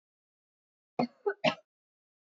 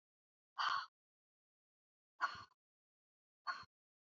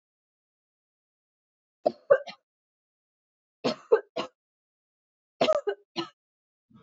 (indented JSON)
{
  "cough_length": "2.3 s",
  "cough_amplitude": 8801,
  "cough_signal_mean_std_ratio": 0.24,
  "exhalation_length": "4.1 s",
  "exhalation_amplitude": 1888,
  "exhalation_signal_mean_std_ratio": 0.27,
  "three_cough_length": "6.8 s",
  "three_cough_amplitude": 14324,
  "three_cough_signal_mean_std_ratio": 0.23,
  "survey_phase": "beta (2021-08-13 to 2022-03-07)",
  "age": "18-44",
  "gender": "Female",
  "wearing_mask": "Yes",
  "symptom_cough_any": true,
  "symptom_sore_throat": true,
  "symptom_fever_high_temperature": true,
  "symptom_other": true,
  "symptom_onset": "2 days",
  "smoker_status": "Never smoked",
  "respiratory_condition_asthma": false,
  "respiratory_condition_other": false,
  "recruitment_source": "Test and Trace",
  "submission_delay": "2 days",
  "covid_test_result": "Positive",
  "covid_test_method": "RT-qPCR",
  "covid_ct_value": 29.3,
  "covid_ct_gene": "ORF1ab gene",
  "covid_ct_mean": 29.6,
  "covid_viral_load": "200 copies/ml",
  "covid_viral_load_category": "Minimal viral load (< 10K copies/ml)"
}